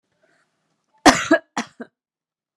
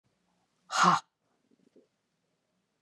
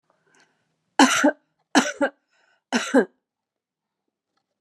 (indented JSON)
{
  "cough_length": "2.6 s",
  "cough_amplitude": 32767,
  "cough_signal_mean_std_ratio": 0.24,
  "exhalation_length": "2.8 s",
  "exhalation_amplitude": 8543,
  "exhalation_signal_mean_std_ratio": 0.24,
  "three_cough_length": "4.6 s",
  "three_cough_amplitude": 28646,
  "three_cough_signal_mean_std_ratio": 0.31,
  "survey_phase": "beta (2021-08-13 to 2022-03-07)",
  "age": "45-64",
  "gender": "Female",
  "wearing_mask": "No",
  "symptom_cough_any": true,
  "symptom_headache": true,
  "symptom_onset": "9 days",
  "smoker_status": "Ex-smoker",
  "respiratory_condition_asthma": true,
  "respiratory_condition_other": false,
  "recruitment_source": "Test and Trace",
  "submission_delay": "5 days",
  "covid_test_result": "Positive",
  "covid_test_method": "RT-qPCR",
  "covid_ct_value": 22.1,
  "covid_ct_gene": "N gene"
}